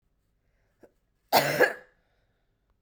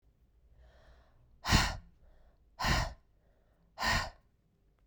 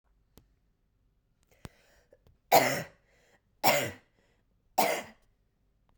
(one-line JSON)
{"cough_length": "2.8 s", "cough_amplitude": 14963, "cough_signal_mean_std_ratio": 0.28, "exhalation_length": "4.9 s", "exhalation_amplitude": 9557, "exhalation_signal_mean_std_ratio": 0.35, "three_cough_length": "6.0 s", "three_cough_amplitude": 14519, "three_cough_signal_mean_std_ratio": 0.27, "survey_phase": "beta (2021-08-13 to 2022-03-07)", "age": "18-44", "gender": "Female", "wearing_mask": "No", "symptom_cough_any": true, "symptom_runny_or_blocked_nose": true, "symptom_onset": "7 days", "smoker_status": "Never smoked", "respiratory_condition_asthma": false, "respiratory_condition_other": false, "recruitment_source": "Test and Trace", "submission_delay": "2 days", "covid_test_result": "Positive", "covid_test_method": "RT-qPCR", "covid_ct_value": 9.5, "covid_ct_gene": "ORF1ab gene"}